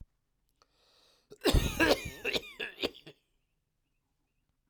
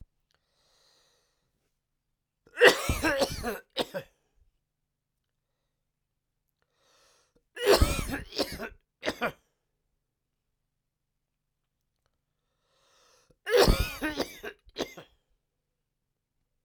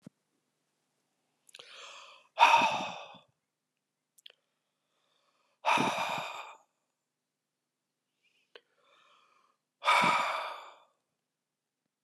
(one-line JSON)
{"cough_length": "4.7 s", "cough_amplitude": 9915, "cough_signal_mean_std_ratio": 0.32, "three_cough_length": "16.6 s", "three_cough_amplitude": 21205, "three_cough_signal_mean_std_ratio": 0.27, "exhalation_length": "12.0 s", "exhalation_amplitude": 13925, "exhalation_signal_mean_std_ratio": 0.3, "survey_phase": "alpha (2021-03-01 to 2021-08-12)", "age": "45-64", "gender": "Male", "wearing_mask": "No", "symptom_cough_any": true, "symptom_new_continuous_cough": true, "symptom_shortness_of_breath": true, "symptom_fatigue": true, "smoker_status": "Never smoked", "respiratory_condition_asthma": false, "respiratory_condition_other": false, "recruitment_source": "Test and Trace", "submission_delay": "1 day", "covid_test_result": "Positive", "covid_test_method": "LFT"}